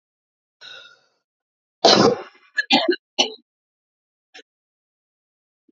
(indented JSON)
{
  "cough_length": "5.7 s",
  "cough_amplitude": 31334,
  "cough_signal_mean_std_ratio": 0.27,
  "survey_phase": "beta (2021-08-13 to 2022-03-07)",
  "age": "18-44",
  "gender": "Female",
  "wearing_mask": "No",
  "symptom_cough_any": true,
  "symptom_fatigue": true,
  "symptom_headache": true,
  "symptom_onset": "10 days",
  "smoker_status": "Current smoker (1 to 10 cigarettes per day)",
  "respiratory_condition_asthma": false,
  "respiratory_condition_other": false,
  "recruitment_source": "REACT",
  "submission_delay": "2 days",
  "covid_test_result": "Negative",
  "covid_test_method": "RT-qPCR",
  "influenza_a_test_result": "Negative",
  "influenza_b_test_result": "Negative"
}